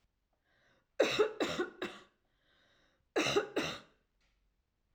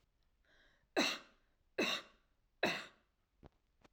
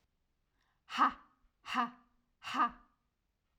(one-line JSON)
{"cough_length": "4.9 s", "cough_amplitude": 4564, "cough_signal_mean_std_ratio": 0.38, "three_cough_length": "3.9 s", "three_cough_amplitude": 2968, "three_cough_signal_mean_std_ratio": 0.33, "exhalation_length": "3.6 s", "exhalation_amplitude": 4727, "exhalation_signal_mean_std_ratio": 0.32, "survey_phase": "alpha (2021-03-01 to 2021-08-12)", "age": "18-44", "gender": "Female", "wearing_mask": "No", "symptom_none": true, "smoker_status": "Never smoked", "respiratory_condition_asthma": false, "respiratory_condition_other": false, "recruitment_source": "REACT", "submission_delay": "1 day", "covid_test_result": "Negative", "covid_test_method": "RT-qPCR"}